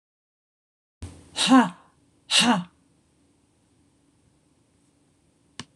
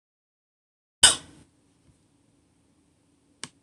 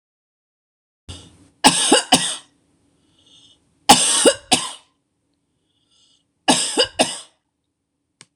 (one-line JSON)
{"exhalation_length": "5.8 s", "exhalation_amplitude": 20953, "exhalation_signal_mean_std_ratio": 0.27, "cough_length": "3.6 s", "cough_amplitude": 25988, "cough_signal_mean_std_ratio": 0.14, "three_cough_length": "8.4 s", "three_cough_amplitude": 26028, "three_cough_signal_mean_std_ratio": 0.33, "survey_phase": "beta (2021-08-13 to 2022-03-07)", "age": "45-64", "gender": "Female", "wearing_mask": "No", "symptom_none": true, "smoker_status": "Never smoked", "respiratory_condition_asthma": false, "respiratory_condition_other": false, "recruitment_source": "REACT", "submission_delay": "1 day", "covid_test_result": "Negative", "covid_test_method": "RT-qPCR", "influenza_a_test_result": "Negative", "influenza_b_test_result": "Negative"}